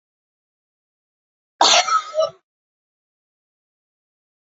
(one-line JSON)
{"cough_length": "4.4 s", "cough_amplitude": 28087, "cough_signal_mean_std_ratio": 0.27, "survey_phase": "alpha (2021-03-01 to 2021-08-12)", "age": "65+", "gender": "Female", "wearing_mask": "No", "symptom_none": true, "smoker_status": "Never smoked", "respiratory_condition_asthma": false, "respiratory_condition_other": false, "recruitment_source": "REACT", "submission_delay": "1 day", "covid_test_result": "Negative", "covid_test_method": "RT-qPCR"}